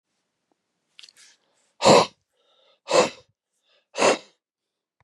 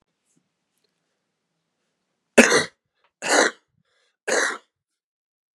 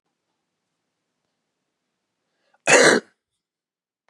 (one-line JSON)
{"exhalation_length": "5.0 s", "exhalation_amplitude": 27606, "exhalation_signal_mean_std_ratio": 0.26, "three_cough_length": "5.5 s", "three_cough_amplitude": 32768, "three_cough_signal_mean_std_ratio": 0.26, "cough_length": "4.1 s", "cough_amplitude": 29993, "cough_signal_mean_std_ratio": 0.22, "survey_phase": "beta (2021-08-13 to 2022-03-07)", "age": "45-64", "gender": "Male", "wearing_mask": "No", "symptom_cough_any": true, "symptom_headache": true, "symptom_onset": "3 days", "smoker_status": "Never smoked", "respiratory_condition_asthma": false, "respiratory_condition_other": false, "recruitment_source": "Test and Trace", "submission_delay": "2 days", "covid_test_result": "Positive", "covid_test_method": "RT-qPCR", "covid_ct_value": 17.6, "covid_ct_gene": "ORF1ab gene", "covid_ct_mean": 18.5, "covid_viral_load": "880000 copies/ml", "covid_viral_load_category": "Low viral load (10K-1M copies/ml)"}